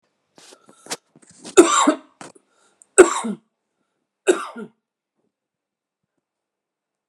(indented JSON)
{
  "three_cough_length": "7.1 s",
  "three_cough_amplitude": 32768,
  "three_cough_signal_mean_std_ratio": 0.23,
  "survey_phase": "beta (2021-08-13 to 2022-03-07)",
  "age": "45-64",
  "gender": "Male",
  "wearing_mask": "No",
  "symptom_fatigue": true,
  "symptom_onset": "9 days",
  "smoker_status": "Current smoker (1 to 10 cigarettes per day)",
  "respiratory_condition_asthma": false,
  "respiratory_condition_other": false,
  "recruitment_source": "REACT",
  "submission_delay": "1 day",
  "covid_test_result": "Negative",
  "covid_test_method": "RT-qPCR"
}